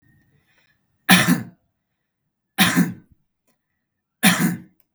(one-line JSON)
{"three_cough_length": "4.9 s", "three_cough_amplitude": 32768, "three_cough_signal_mean_std_ratio": 0.34, "survey_phase": "beta (2021-08-13 to 2022-03-07)", "age": "18-44", "gender": "Male", "wearing_mask": "No", "symptom_none": true, "smoker_status": "Never smoked", "respiratory_condition_asthma": false, "respiratory_condition_other": false, "recruitment_source": "REACT", "submission_delay": "0 days", "covid_test_result": "Negative", "covid_test_method": "RT-qPCR", "influenza_a_test_result": "Negative", "influenza_b_test_result": "Negative"}